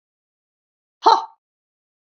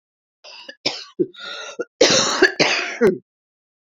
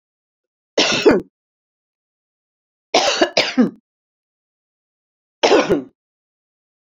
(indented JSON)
{
  "exhalation_length": "2.1 s",
  "exhalation_amplitude": 28397,
  "exhalation_signal_mean_std_ratio": 0.2,
  "cough_length": "3.8 s",
  "cough_amplitude": 29847,
  "cough_signal_mean_std_ratio": 0.46,
  "three_cough_length": "6.8 s",
  "three_cough_amplitude": 32767,
  "three_cough_signal_mean_std_ratio": 0.34,
  "survey_phase": "beta (2021-08-13 to 2022-03-07)",
  "age": "65+",
  "gender": "Female",
  "wearing_mask": "No",
  "symptom_cough_any": true,
  "symptom_new_continuous_cough": true,
  "symptom_runny_or_blocked_nose": true,
  "symptom_sore_throat": true,
  "symptom_fatigue": true,
  "symptom_fever_high_temperature": true,
  "symptom_headache": true,
  "smoker_status": "Never smoked",
  "respiratory_condition_asthma": false,
  "respiratory_condition_other": false,
  "recruitment_source": "Test and Trace",
  "submission_delay": "2 days",
  "covid_test_result": "Positive",
  "covid_test_method": "RT-qPCR",
  "covid_ct_value": 33.7,
  "covid_ct_gene": "ORF1ab gene"
}